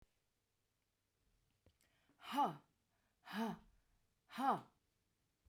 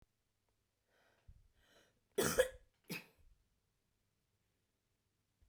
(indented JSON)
{
  "exhalation_length": "5.5 s",
  "exhalation_amplitude": 1498,
  "exhalation_signal_mean_std_ratio": 0.3,
  "cough_length": "5.5 s",
  "cough_amplitude": 4273,
  "cough_signal_mean_std_ratio": 0.2,
  "survey_phase": "beta (2021-08-13 to 2022-03-07)",
  "age": "45-64",
  "gender": "Female",
  "wearing_mask": "No",
  "symptom_cough_any": true,
  "symptom_fatigue": true,
  "symptom_headache": true,
  "symptom_change_to_sense_of_smell_or_taste": true,
  "symptom_onset": "12 days",
  "smoker_status": "Ex-smoker",
  "respiratory_condition_asthma": false,
  "respiratory_condition_other": false,
  "recruitment_source": "REACT",
  "submission_delay": "1 day",
  "covid_test_result": "Negative",
  "covid_test_method": "RT-qPCR"
}